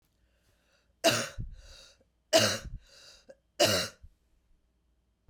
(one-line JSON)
{"three_cough_length": "5.3 s", "three_cough_amplitude": 10709, "three_cough_signal_mean_std_ratio": 0.33, "survey_phase": "beta (2021-08-13 to 2022-03-07)", "age": "45-64", "gender": "Female", "wearing_mask": "No", "symptom_runny_or_blocked_nose": true, "symptom_sore_throat": true, "symptom_fatigue": true, "smoker_status": "Never smoked", "respiratory_condition_asthma": true, "respiratory_condition_other": false, "recruitment_source": "Test and Trace", "submission_delay": "2 days", "covid_test_result": "Positive", "covid_test_method": "RT-qPCR", "covid_ct_value": 18.9, "covid_ct_gene": "ORF1ab gene", "covid_ct_mean": 19.5, "covid_viral_load": "390000 copies/ml", "covid_viral_load_category": "Low viral load (10K-1M copies/ml)"}